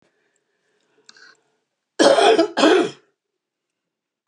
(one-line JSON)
{"cough_length": "4.3 s", "cough_amplitude": 31604, "cough_signal_mean_std_ratio": 0.35, "survey_phase": "beta (2021-08-13 to 2022-03-07)", "age": "65+", "gender": "Female", "wearing_mask": "No", "symptom_cough_any": true, "smoker_status": "Ex-smoker", "respiratory_condition_asthma": false, "respiratory_condition_other": true, "recruitment_source": "REACT", "submission_delay": "2 days", "covid_test_result": "Negative", "covid_test_method": "RT-qPCR", "influenza_a_test_result": "Negative", "influenza_b_test_result": "Negative"}